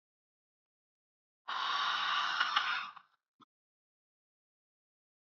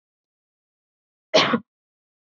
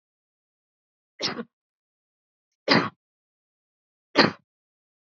{
  "exhalation_length": "5.3 s",
  "exhalation_amplitude": 7496,
  "exhalation_signal_mean_std_ratio": 0.43,
  "cough_length": "2.2 s",
  "cough_amplitude": 20309,
  "cough_signal_mean_std_ratio": 0.25,
  "three_cough_length": "5.1 s",
  "three_cough_amplitude": 20192,
  "three_cough_signal_mean_std_ratio": 0.21,
  "survey_phase": "beta (2021-08-13 to 2022-03-07)",
  "age": "18-44",
  "gender": "Female",
  "wearing_mask": "No",
  "symptom_none": true,
  "smoker_status": "Never smoked",
  "respiratory_condition_asthma": false,
  "respiratory_condition_other": false,
  "recruitment_source": "REACT",
  "submission_delay": "3 days",
  "covid_test_result": "Negative",
  "covid_test_method": "RT-qPCR"
}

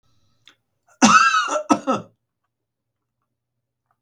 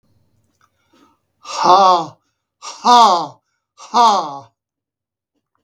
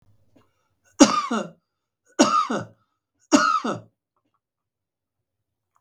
{
  "cough_length": "4.0 s",
  "cough_amplitude": 32768,
  "cough_signal_mean_std_ratio": 0.33,
  "exhalation_length": "5.6 s",
  "exhalation_amplitude": 32768,
  "exhalation_signal_mean_std_ratio": 0.39,
  "three_cough_length": "5.8 s",
  "three_cough_amplitude": 32768,
  "three_cough_signal_mean_std_ratio": 0.32,
  "survey_phase": "beta (2021-08-13 to 2022-03-07)",
  "age": "65+",
  "gender": "Male",
  "wearing_mask": "No",
  "symptom_cough_any": true,
  "smoker_status": "Ex-smoker",
  "respiratory_condition_asthma": false,
  "respiratory_condition_other": false,
  "recruitment_source": "REACT",
  "submission_delay": "6 days",
  "covid_test_result": "Negative",
  "covid_test_method": "RT-qPCR",
  "influenza_a_test_result": "Negative",
  "influenza_b_test_result": "Negative"
}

